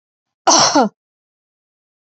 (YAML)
cough_length: 2.0 s
cough_amplitude: 32170
cough_signal_mean_std_ratio: 0.36
survey_phase: beta (2021-08-13 to 2022-03-07)
age: 45-64
gender: Female
wearing_mask: 'No'
symptom_none: true
smoker_status: Never smoked
respiratory_condition_asthma: true
respiratory_condition_other: false
recruitment_source: REACT
submission_delay: 2 days
covid_test_result: Negative
covid_test_method: RT-qPCR